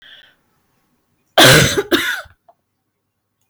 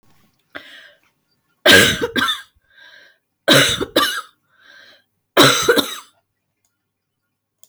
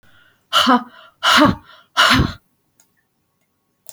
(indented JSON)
{
  "cough_length": "3.5 s",
  "cough_amplitude": 32768,
  "cough_signal_mean_std_ratio": 0.34,
  "three_cough_length": "7.7 s",
  "three_cough_amplitude": 32767,
  "three_cough_signal_mean_std_ratio": 0.36,
  "exhalation_length": "3.9 s",
  "exhalation_amplitude": 30235,
  "exhalation_signal_mean_std_ratio": 0.41,
  "survey_phase": "beta (2021-08-13 to 2022-03-07)",
  "age": "45-64",
  "gender": "Female",
  "wearing_mask": "No",
  "symptom_cough_any": true,
  "symptom_headache": true,
  "symptom_onset": "12 days",
  "smoker_status": "Never smoked",
  "respiratory_condition_asthma": false,
  "respiratory_condition_other": false,
  "recruitment_source": "REACT",
  "submission_delay": "2 days",
  "covid_test_result": "Negative",
  "covid_test_method": "RT-qPCR"
}